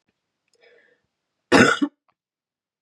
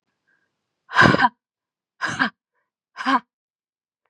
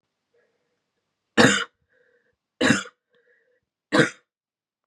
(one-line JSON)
{"cough_length": "2.8 s", "cough_amplitude": 30730, "cough_signal_mean_std_ratio": 0.25, "exhalation_length": "4.1 s", "exhalation_amplitude": 31790, "exhalation_signal_mean_std_ratio": 0.3, "three_cough_length": "4.9 s", "three_cough_amplitude": 27077, "three_cough_signal_mean_std_ratio": 0.27, "survey_phase": "beta (2021-08-13 to 2022-03-07)", "age": "18-44", "gender": "Female", "wearing_mask": "No", "symptom_cough_any": true, "symptom_runny_or_blocked_nose": true, "symptom_shortness_of_breath": true, "symptom_sore_throat": true, "symptom_onset": "3 days", "smoker_status": "Never smoked", "respiratory_condition_asthma": true, "respiratory_condition_other": false, "recruitment_source": "Test and Trace", "submission_delay": "1 day", "covid_test_result": "Positive", "covid_test_method": "ePCR"}